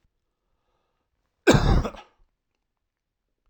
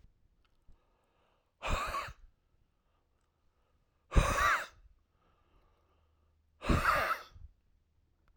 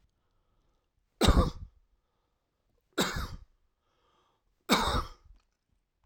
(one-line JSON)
{"cough_length": "3.5 s", "cough_amplitude": 21693, "cough_signal_mean_std_ratio": 0.26, "exhalation_length": "8.4 s", "exhalation_amplitude": 7428, "exhalation_signal_mean_std_ratio": 0.33, "three_cough_length": "6.1 s", "three_cough_amplitude": 14200, "three_cough_signal_mean_std_ratio": 0.3, "survey_phase": "alpha (2021-03-01 to 2021-08-12)", "age": "65+", "gender": "Male", "wearing_mask": "No", "symptom_none": true, "smoker_status": "Never smoked", "respiratory_condition_asthma": false, "respiratory_condition_other": false, "recruitment_source": "REACT", "submission_delay": "2 days", "covid_test_result": "Negative", "covid_test_method": "RT-qPCR"}